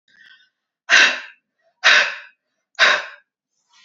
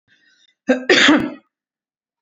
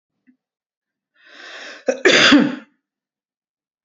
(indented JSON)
{
  "exhalation_length": "3.8 s",
  "exhalation_amplitude": 32767,
  "exhalation_signal_mean_std_ratio": 0.36,
  "cough_length": "2.2 s",
  "cough_amplitude": 30403,
  "cough_signal_mean_std_ratio": 0.39,
  "three_cough_length": "3.8 s",
  "three_cough_amplitude": 32767,
  "three_cough_signal_mean_std_ratio": 0.32,
  "survey_phase": "beta (2021-08-13 to 2022-03-07)",
  "age": "45-64",
  "gender": "Female",
  "wearing_mask": "No",
  "symptom_none": true,
  "smoker_status": "Ex-smoker",
  "respiratory_condition_asthma": false,
  "respiratory_condition_other": false,
  "recruitment_source": "Test and Trace",
  "submission_delay": "0 days",
  "covid_test_result": "Negative",
  "covid_test_method": "LFT"
}